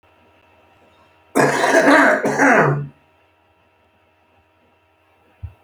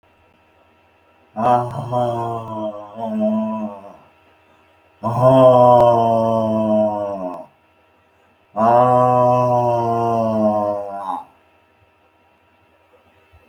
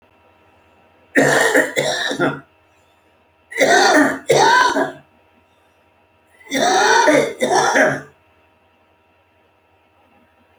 {"cough_length": "5.6 s", "cough_amplitude": 32768, "cough_signal_mean_std_ratio": 0.43, "exhalation_length": "13.5 s", "exhalation_amplitude": 29427, "exhalation_signal_mean_std_ratio": 0.6, "three_cough_length": "10.6 s", "three_cough_amplitude": 28095, "three_cough_signal_mean_std_ratio": 0.51, "survey_phase": "beta (2021-08-13 to 2022-03-07)", "age": "65+", "gender": "Male", "wearing_mask": "No", "symptom_cough_any": true, "smoker_status": "Current smoker (11 or more cigarettes per day)", "respiratory_condition_asthma": false, "respiratory_condition_other": true, "recruitment_source": "REACT", "submission_delay": "2 days", "covid_test_result": "Negative", "covid_test_method": "RT-qPCR"}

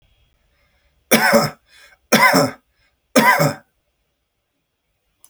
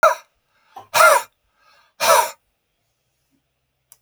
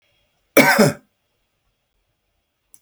{"three_cough_length": "5.3 s", "three_cough_amplitude": 32767, "three_cough_signal_mean_std_ratio": 0.37, "exhalation_length": "4.0 s", "exhalation_amplitude": 32470, "exhalation_signal_mean_std_ratio": 0.32, "cough_length": "2.8 s", "cough_amplitude": 32768, "cough_signal_mean_std_ratio": 0.28, "survey_phase": "beta (2021-08-13 to 2022-03-07)", "age": "65+", "gender": "Male", "wearing_mask": "No", "symptom_none": true, "smoker_status": "Ex-smoker", "respiratory_condition_asthma": false, "respiratory_condition_other": false, "recruitment_source": "REACT", "submission_delay": "5 days", "covid_test_result": "Negative", "covid_test_method": "RT-qPCR"}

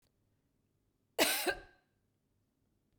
{"cough_length": "3.0 s", "cough_amplitude": 6472, "cough_signal_mean_std_ratio": 0.27, "survey_phase": "beta (2021-08-13 to 2022-03-07)", "age": "45-64", "gender": "Female", "wearing_mask": "No", "symptom_none": true, "smoker_status": "Never smoked", "respiratory_condition_asthma": false, "respiratory_condition_other": false, "recruitment_source": "REACT", "submission_delay": "3 days", "covid_test_result": "Negative", "covid_test_method": "RT-qPCR", "influenza_a_test_result": "Negative", "influenza_b_test_result": "Negative"}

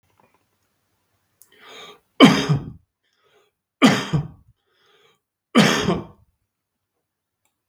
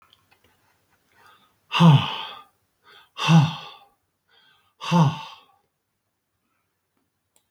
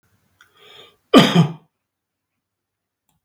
{"three_cough_length": "7.7 s", "three_cough_amplitude": 32768, "three_cough_signal_mean_std_ratio": 0.28, "exhalation_length": "7.5 s", "exhalation_amplitude": 21834, "exhalation_signal_mean_std_ratio": 0.3, "cough_length": "3.2 s", "cough_amplitude": 32768, "cough_signal_mean_std_ratio": 0.25, "survey_phase": "beta (2021-08-13 to 2022-03-07)", "age": "45-64", "gender": "Male", "wearing_mask": "No", "symptom_none": true, "smoker_status": "Never smoked", "respiratory_condition_asthma": false, "respiratory_condition_other": false, "recruitment_source": "REACT", "submission_delay": "1 day", "covid_test_result": "Negative", "covid_test_method": "RT-qPCR"}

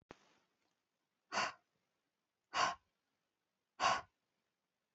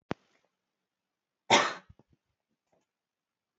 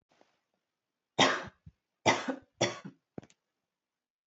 {"exhalation_length": "4.9 s", "exhalation_amplitude": 3314, "exhalation_signal_mean_std_ratio": 0.27, "cough_length": "3.6 s", "cough_amplitude": 11802, "cough_signal_mean_std_ratio": 0.19, "three_cough_length": "4.3 s", "three_cough_amplitude": 9973, "three_cough_signal_mean_std_ratio": 0.28, "survey_phase": "alpha (2021-03-01 to 2021-08-12)", "age": "18-44", "gender": "Female", "wearing_mask": "No", "symptom_none": true, "smoker_status": "Never smoked", "respiratory_condition_asthma": false, "respiratory_condition_other": false, "recruitment_source": "REACT", "submission_delay": "4 days", "covid_test_result": "Negative", "covid_test_method": "RT-qPCR"}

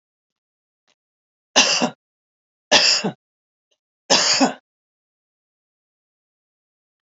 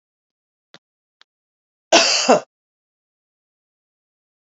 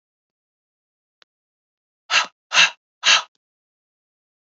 {"three_cough_length": "7.1 s", "three_cough_amplitude": 30618, "three_cough_signal_mean_std_ratio": 0.3, "cough_length": "4.4 s", "cough_amplitude": 30431, "cough_signal_mean_std_ratio": 0.24, "exhalation_length": "4.5 s", "exhalation_amplitude": 27823, "exhalation_signal_mean_std_ratio": 0.24, "survey_phase": "beta (2021-08-13 to 2022-03-07)", "age": "45-64", "gender": "Female", "wearing_mask": "No", "symptom_none": true, "smoker_status": "Never smoked", "respiratory_condition_asthma": false, "respiratory_condition_other": false, "recruitment_source": "REACT", "submission_delay": "2 days", "covid_test_result": "Negative", "covid_test_method": "RT-qPCR", "influenza_a_test_result": "Negative", "influenza_b_test_result": "Negative"}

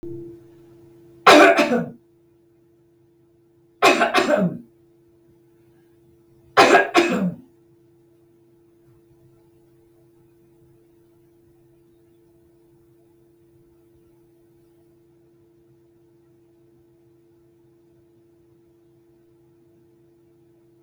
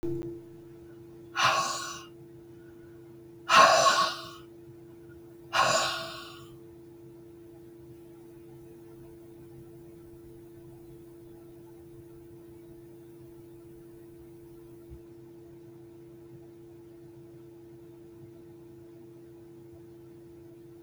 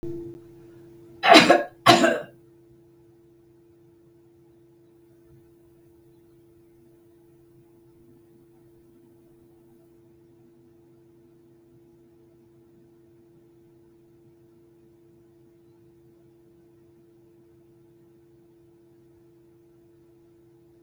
{"three_cough_length": "20.8 s", "three_cough_amplitude": 32768, "three_cough_signal_mean_std_ratio": 0.25, "exhalation_length": "20.8 s", "exhalation_amplitude": 15929, "exhalation_signal_mean_std_ratio": 0.36, "cough_length": "20.8 s", "cough_amplitude": 32768, "cough_signal_mean_std_ratio": 0.18, "survey_phase": "beta (2021-08-13 to 2022-03-07)", "age": "65+", "gender": "Female", "wearing_mask": "No", "symptom_cough_any": true, "smoker_status": "Never smoked", "respiratory_condition_asthma": false, "respiratory_condition_other": false, "recruitment_source": "REACT", "submission_delay": "1 day", "covid_test_result": "Negative", "covid_test_method": "RT-qPCR", "influenza_a_test_result": "Negative", "influenza_b_test_result": "Negative"}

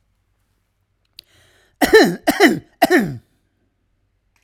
{"three_cough_length": "4.4 s", "three_cough_amplitude": 32768, "three_cough_signal_mean_std_ratio": 0.33, "survey_phase": "alpha (2021-03-01 to 2021-08-12)", "age": "65+", "gender": "Male", "wearing_mask": "No", "symptom_none": true, "smoker_status": "Never smoked", "respiratory_condition_asthma": false, "respiratory_condition_other": false, "recruitment_source": "REACT", "submission_delay": "1 day", "covid_test_result": "Negative", "covid_test_method": "RT-qPCR"}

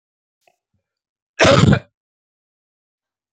{"cough_length": "3.3 s", "cough_amplitude": 31918, "cough_signal_mean_std_ratio": 0.27, "survey_phase": "alpha (2021-03-01 to 2021-08-12)", "age": "65+", "gender": "Male", "wearing_mask": "No", "symptom_none": true, "smoker_status": "Never smoked", "respiratory_condition_asthma": false, "respiratory_condition_other": true, "recruitment_source": "REACT", "submission_delay": "2 days", "covid_test_result": "Negative", "covid_test_method": "RT-qPCR"}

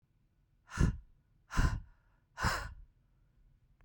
{"exhalation_length": "3.8 s", "exhalation_amplitude": 5242, "exhalation_signal_mean_std_ratio": 0.34, "survey_phase": "beta (2021-08-13 to 2022-03-07)", "age": "18-44", "gender": "Female", "wearing_mask": "No", "symptom_cough_any": true, "symptom_runny_or_blocked_nose": true, "symptom_diarrhoea": true, "symptom_fatigue": true, "smoker_status": "Ex-smoker", "respiratory_condition_asthma": true, "respiratory_condition_other": false, "recruitment_source": "Test and Trace", "submission_delay": "2 days", "covid_test_result": "Positive", "covid_test_method": "RT-qPCR", "covid_ct_value": 17.2, "covid_ct_gene": "ORF1ab gene", "covid_ct_mean": 18.2, "covid_viral_load": "1100000 copies/ml", "covid_viral_load_category": "High viral load (>1M copies/ml)"}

